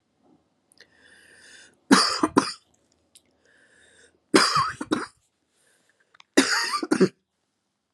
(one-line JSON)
{"three_cough_length": "7.9 s", "three_cough_amplitude": 30937, "three_cough_signal_mean_std_ratio": 0.32, "survey_phase": "alpha (2021-03-01 to 2021-08-12)", "age": "18-44", "gender": "Female", "wearing_mask": "No", "symptom_fatigue": true, "symptom_change_to_sense_of_smell_or_taste": true, "symptom_loss_of_taste": true, "symptom_onset": "5 days", "smoker_status": "Current smoker (1 to 10 cigarettes per day)", "respiratory_condition_asthma": false, "respiratory_condition_other": false, "recruitment_source": "Test and Trace", "submission_delay": "3 days", "covid_test_result": "Positive", "covid_test_method": "RT-qPCR", "covid_ct_value": 19.6, "covid_ct_gene": "ORF1ab gene", "covid_ct_mean": 19.7, "covid_viral_load": "340000 copies/ml", "covid_viral_load_category": "Low viral load (10K-1M copies/ml)"}